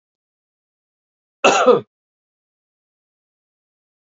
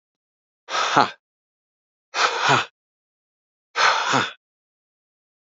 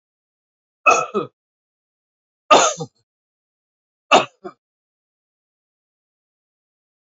{"cough_length": "4.0 s", "cough_amplitude": 28281, "cough_signal_mean_std_ratio": 0.23, "exhalation_length": "5.5 s", "exhalation_amplitude": 32768, "exhalation_signal_mean_std_ratio": 0.38, "three_cough_length": "7.2 s", "three_cough_amplitude": 28951, "three_cough_signal_mean_std_ratio": 0.22, "survey_phase": "beta (2021-08-13 to 2022-03-07)", "age": "45-64", "gender": "Male", "wearing_mask": "No", "symptom_none": true, "smoker_status": "Never smoked", "respiratory_condition_asthma": false, "respiratory_condition_other": false, "recruitment_source": "REACT", "submission_delay": "4 days", "covid_test_result": "Negative", "covid_test_method": "RT-qPCR"}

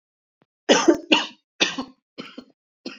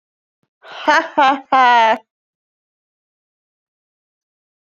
{"three_cough_length": "3.0 s", "three_cough_amplitude": 25921, "three_cough_signal_mean_std_ratio": 0.34, "exhalation_length": "4.6 s", "exhalation_amplitude": 29244, "exhalation_signal_mean_std_ratio": 0.34, "survey_phase": "alpha (2021-03-01 to 2021-08-12)", "age": "18-44", "gender": "Female", "wearing_mask": "No", "symptom_cough_any": true, "symptom_fatigue": true, "symptom_fever_high_temperature": true, "symptom_change_to_sense_of_smell_or_taste": true, "symptom_loss_of_taste": true, "symptom_onset": "3 days", "smoker_status": "Ex-smoker", "respiratory_condition_asthma": false, "respiratory_condition_other": false, "recruitment_source": "Test and Trace", "submission_delay": "2 days", "covid_test_result": "Positive", "covid_test_method": "RT-qPCR", "covid_ct_value": 16.4, "covid_ct_gene": "ORF1ab gene", "covid_ct_mean": 16.8, "covid_viral_load": "3100000 copies/ml", "covid_viral_load_category": "High viral load (>1M copies/ml)"}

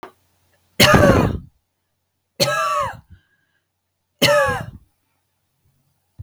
{"three_cough_length": "6.2 s", "three_cough_amplitude": 32768, "three_cough_signal_mean_std_ratio": 0.38, "survey_phase": "beta (2021-08-13 to 2022-03-07)", "age": "45-64", "gender": "Female", "wearing_mask": "No", "symptom_none": true, "smoker_status": "Never smoked", "respiratory_condition_asthma": false, "respiratory_condition_other": false, "recruitment_source": "REACT", "submission_delay": "1 day", "covid_test_result": "Negative", "covid_test_method": "RT-qPCR", "influenza_a_test_result": "Negative", "influenza_b_test_result": "Negative"}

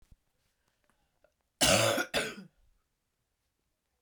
{"cough_length": "4.0 s", "cough_amplitude": 10585, "cough_signal_mean_std_ratio": 0.31, "survey_phase": "beta (2021-08-13 to 2022-03-07)", "age": "45-64", "gender": "Female", "wearing_mask": "No", "symptom_cough_any": true, "symptom_new_continuous_cough": true, "symptom_runny_or_blocked_nose": true, "symptom_sore_throat": true, "symptom_abdominal_pain": true, "symptom_fatigue": true, "symptom_headache": true, "symptom_other": true, "smoker_status": "Never smoked", "respiratory_condition_asthma": false, "respiratory_condition_other": false, "recruitment_source": "Test and Trace", "submission_delay": "3 days", "covid_test_result": "Positive", "covid_test_method": "RT-qPCR", "covid_ct_value": 20.6, "covid_ct_gene": "N gene"}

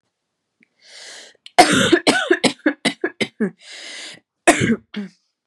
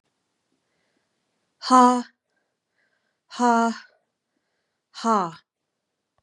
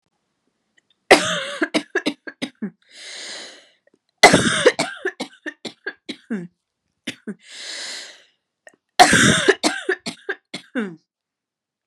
{"cough_length": "5.5 s", "cough_amplitude": 32768, "cough_signal_mean_std_ratio": 0.4, "exhalation_length": "6.2 s", "exhalation_amplitude": 27543, "exhalation_signal_mean_std_ratio": 0.28, "three_cough_length": "11.9 s", "three_cough_amplitude": 32768, "three_cough_signal_mean_std_ratio": 0.34, "survey_phase": "beta (2021-08-13 to 2022-03-07)", "age": "45-64", "gender": "Female", "wearing_mask": "No", "symptom_cough_any": true, "symptom_runny_or_blocked_nose": true, "symptom_fatigue": true, "symptom_headache": true, "symptom_change_to_sense_of_smell_or_taste": true, "symptom_other": true, "symptom_onset": "3 days", "smoker_status": "Never smoked", "respiratory_condition_asthma": false, "respiratory_condition_other": false, "recruitment_source": "Test and Trace", "submission_delay": "1 day", "covid_test_result": "Positive", "covid_test_method": "ePCR"}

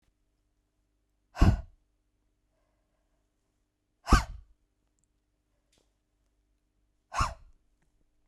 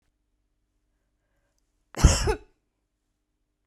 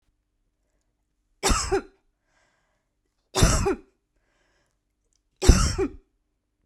{"exhalation_length": "8.3 s", "exhalation_amplitude": 15427, "exhalation_signal_mean_std_ratio": 0.18, "cough_length": "3.7 s", "cough_amplitude": 30329, "cough_signal_mean_std_ratio": 0.2, "three_cough_length": "6.7 s", "three_cough_amplitude": 31799, "three_cough_signal_mean_std_ratio": 0.3, "survey_phase": "beta (2021-08-13 to 2022-03-07)", "age": "18-44", "gender": "Female", "wearing_mask": "No", "symptom_none": true, "symptom_onset": "6 days", "smoker_status": "Ex-smoker", "respiratory_condition_asthma": true, "respiratory_condition_other": false, "recruitment_source": "REACT", "submission_delay": "1 day", "covid_test_result": "Negative", "covid_test_method": "RT-qPCR"}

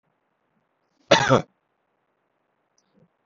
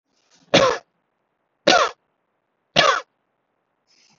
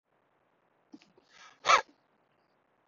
{"cough_length": "3.3 s", "cough_amplitude": 29416, "cough_signal_mean_std_ratio": 0.21, "three_cough_length": "4.2 s", "three_cough_amplitude": 32768, "three_cough_signal_mean_std_ratio": 0.31, "exhalation_length": "2.9 s", "exhalation_amplitude": 10200, "exhalation_signal_mean_std_ratio": 0.18, "survey_phase": "beta (2021-08-13 to 2022-03-07)", "age": "18-44", "gender": "Male", "wearing_mask": "No", "symptom_none": true, "smoker_status": "Ex-smoker", "respiratory_condition_asthma": false, "respiratory_condition_other": false, "recruitment_source": "REACT", "submission_delay": "1 day", "covid_test_result": "Negative", "covid_test_method": "RT-qPCR", "influenza_a_test_result": "Unknown/Void", "influenza_b_test_result": "Unknown/Void"}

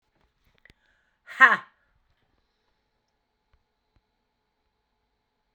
{"exhalation_length": "5.5 s", "exhalation_amplitude": 29084, "exhalation_signal_mean_std_ratio": 0.13, "survey_phase": "alpha (2021-03-01 to 2021-08-12)", "age": "65+", "gender": "Female", "wearing_mask": "No", "symptom_cough_any": true, "symptom_shortness_of_breath": true, "symptom_diarrhoea": true, "symptom_fatigue": true, "symptom_fever_high_temperature": true, "symptom_headache": true, "smoker_status": "Never smoked", "respiratory_condition_asthma": false, "respiratory_condition_other": false, "recruitment_source": "Test and Trace", "submission_delay": "3 days", "covid_test_result": "Positive", "covid_test_method": "LFT"}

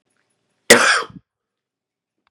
{"cough_length": "2.3 s", "cough_amplitude": 32768, "cough_signal_mean_std_ratio": 0.27, "survey_phase": "beta (2021-08-13 to 2022-03-07)", "age": "45-64", "gender": "Male", "wearing_mask": "No", "symptom_cough_any": true, "symptom_runny_or_blocked_nose": true, "symptom_sore_throat": true, "symptom_diarrhoea": true, "symptom_fatigue": true, "symptom_headache": true, "symptom_change_to_sense_of_smell_or_taste": true, "symptom_onset": "2 days", "smoker_status": "Ex-smoker", "respiratory_condition_asthma": false, "respiratory_condition_other": false, "recruitment_source": "Test and Trace", "submission_delay": "0 days", "covid_test_result": "Positive", "covid_test_method": "RT-qPCR", "covid_ct_value": 16.9, "covid_ct_gene": "N gene"}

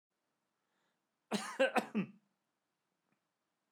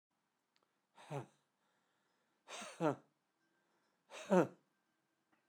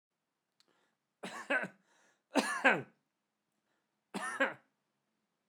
{"cough_length": "3.7 s", "cough_amplitude": 5310, "cough_signal_mean_std_ratio": 0.27, "exhalation_length": "5.5 s", "exhalation_amplitude": 3683, "exhalation_signal_mean_std_ratio": 0.21, "three_cough_length": "5.5 s", "three_cough_amplitude": 9554, "three_cough_signal_mean_std_ratio": 0.29, "survey_phase": "beta (2021-08-13 to 2022-03-07)", "age": "65+", "gender": "Male", "wearing_mask": "No", "symptom_none": true, "smoker_status": "Never smoked", "respiratory_condition_asthma": false, "respiratory_condition_other": false, "recruitment_source": "REACT", "submission_delay": "2 days", "covid_test_result": "Negative", "covid_test_method": "RT-qPCR"}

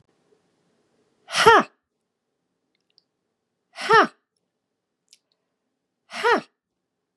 {"exhalation_length": "7.2 s", "exhalation_amplitude": 32486, "exhalation_signal_mean_std_ratio": 0.22, "survey_phase": "beta (2021-08-13 to 2022-03-07)", "age": "45-64", "gender": "Female", "wearing_mask": "No", "symptom_runny_or_blocked_nose": true, "symptom_fatigue": true, "symptom_change_to_sense_of_smell_or_taste": true, "smoker_status": "Never smoked", "respiratory_condition_asthma": false, "respiratory_condition_other": false, "recruitment_source": "Test and Trace", "submission_delay": "1 day", "covid_test_result": "Positive", "covid_test_method": "RT-qPCR", "covid_ct_value": 18.7, "covid_ct_gene": "ORF1ab gene"}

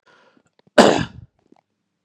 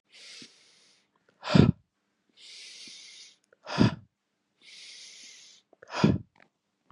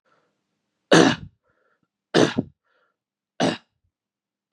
{"cough_length": "2.0 s", "cough_amplitude": 32768, "cough_signal_mean_std_ratio": 0.25, "exhalation_length": "6.9 s", "exhalation_amplitude": 24905, "exhalation_signal_mean_std_ratio": 0.25, "three_cough_length": "4.5 s", "three_cough_amplitude": 29409, "three_cough_signal_mean_std_ratio": 0.27, "survey_phase": "beta (2021-08-13 to 2022-03-07)", "age": "45-64", "gender": "Male", "wearing_mask": "No", "symptom_cough_any": true, "symptom_new_continuous_cough": true, "symptom_runny_or_blocked_nose": true, "symptom_sore_throat": true, "symptom_fever_high_temperature": true, "symptom_loss_of_taste": true, "symptom_onset": "3 days", "smoker_status": "Never smoked", "respiratory_condition_asthma": false, "respiratory_condition_other": false, "recruitment_source": "Test and Trace", "submission_delay": "1 day", "covid_test_result": "Positive", "covid_test_method": "RT-qPCR", "covid_ct_value": 17.3, "covid_ct_gene": "ORF1ab gene", "covid_ct_mean": 17.9, "covid_viral_load": "1400000 copies/ml", "covid_viral_load_category": "High viral load (>1M copies/ml)"}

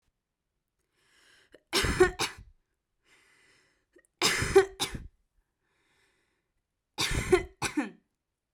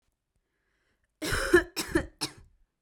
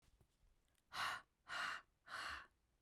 {"three_cough_length": "8.5 s", "three_cough_amplitude": 11075, "three_cough_signal_mean_std_ratio": 0.31, "cough_length": "2.8 s", "cough_amplitude": 11366, "cough_signal_mean_std_ratio": 0.33, "exhalation_length": "2.8 s", "exhalation_amplitude": 958, "exhalation_signal_mean_std_ratio": 0.5, "survey_phase": "beta (2021-08-13 to 2022-03-07)", "age": "18-44", "gender": "Female", "wearing_mask": "No", "symptom_none": true, "smoker_status": "Never smoked", "respiratory_condition_asthma": false, "respiratory_condition_other": false, "recruitment_source": "REACT", "submission_delay": "5 days", "covid_test_result": "Negative", "covid_test_method": "RT-qPCR", "influenza_a_test_result": "Negative", "influenza_b_test_result": "Negative"}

